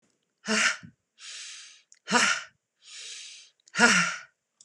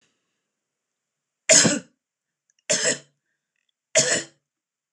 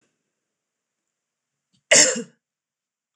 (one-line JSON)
{"exhalation_length": "4.6 s", "exhalation_amplitude": 17380, "exhalation_signal_mean_std_ratio": 0.4, "three_cough_length": "4.9 s", "three_cough_amplitude": 25797, "three_cough_signal_mean_std_ratio": 0.3, "cough_length": "3.2 s", "cough_amplitude": 26027, "cough_signal_mean_std_ratio": 0.22, "survey_phase": "beta (2021-08-13 to 2022-03-07)", "age": "45-64", "gender": "Female", "wearing_mask": "No", "symptom_none": true, "smoker_status": "Never smoked", "respiratory_condition_asthma": false, "respiratory_condition_other": false, "recruitment_source": "REACT", "submission_delay": "1 day", "covid_test_result": "Negative", "covid_test_method": "RT-qPCR"}